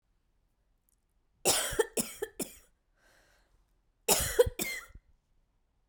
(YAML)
cough_length: 5.9 s
cough_amplitude: 9953
cough_signal_mean_std_ratio: 0.31
survey_phase: beta (2021-08-13 to 2022-03-07)
age: 18-44
gender: Female
wearing_mask: 'No'
symptom_cough_any: true
symptom_runny_or_blocked_nose: true
symptom_sore_throat: true
symptom_fatigue: true
symptom_headache: true
symptom_onset: 2 days
smoker_status: Ex-smoker
respiratory_condition_asthma: true
respiratory_condition_other: false
recruitment_source: Test and Trace
submission_delay: 1 day
covid_test_result: Positive
covid_test_method: RT-qPCR
covid_ct_value: 19.4
covid_ct_gene: ORF1ab gene
covid_ct_mean: 20.1
covid_viral_load: 260000 copies/ml
covid_viral_load_category: Low viral load (10K-1M copies/ml)